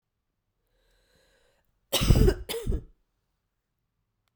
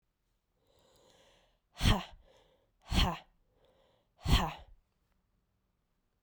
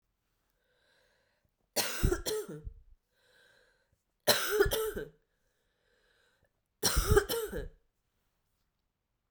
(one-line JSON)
{"cough_length": "4.4 s", "cough_amplitude": 18747, "cough_signal_mean_std_ratio": 0.29, "exhalation_length": "6.2 s", "exhalation_amplitude": 7780, "exhalation_signal_mean_std_ratio": 0.27, "three_cough_length": "9.3 s", "three_cough_amplitude": 11733, "three_cough_signal_mean_std_ratio": 0.36, "survey_phase": "beta (2021-08-13 to 2022-03-07)", "age": "18-44", "gender": "Female", "wearing_mask": "No", "symptom_cough_any": true, "symptom_runny_or_blocked_nose": true, "symptom_shortness_of_breath": true, "symptom_sore_throat": true, "symptom_fatigue": true, "symptom_fever_high_temperature": true, "symptom_headache": true, "symptom_change_to_sense_of_smell_or_taste": true, "symptom_loss_of_taste": true, "symptom_onset": "2 days", "smoker_status": "Never smoked", "respiratory_condition_asthma": false, "respiratory_condition_other": false, "recruitment_source": "Test and Trace", "submission_delay": "2 days", "covid_test_result": "Positive", "covid_test_method": "RT-qPCR", "covid_ct_value": 17.9, "covid_ct_gene": "ORF1ab gene", "covid_ct_mean": 18.4, "covid_viral_load": "930000 copies/ml", "covid_viral_load_category": "Low viral load (10K-1M copies/ml)"}